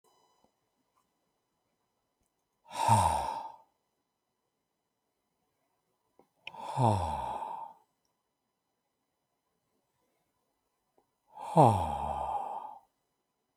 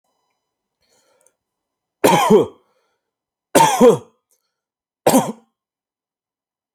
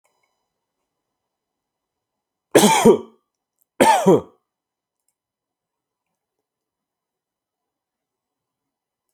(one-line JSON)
{"exhalation_length": "13.6 s", "exhalation_amplitude": 12213, "exhalation_signal_mean_std_ratio": 0.3, "three_cough_length": "6.7 s", "three_cough_amplitude": 31013, "three_cough_signal_mean_std_ratio": 0.31, "cough_length": "9.1 s", "cough_amplitude": 29913, "cough_signal_mean_std_ratio": 0.23, "survey_phase": "alpha (2021-03-01 to 2021-08-12)", "age": "18-44", "gender": "Male", "wearing_mask": "No", "symptom_none": true, "symptom_onset": "12 days", "smoker_status": "Never smoked", "respiratory_condition_asthma": false, "respiratory_condition_other": false, "recruitment_source": "REACT", "submission_delay": "1 day", "covid_test_result": "Negative", "covid_test_method": "RT-qPCR"}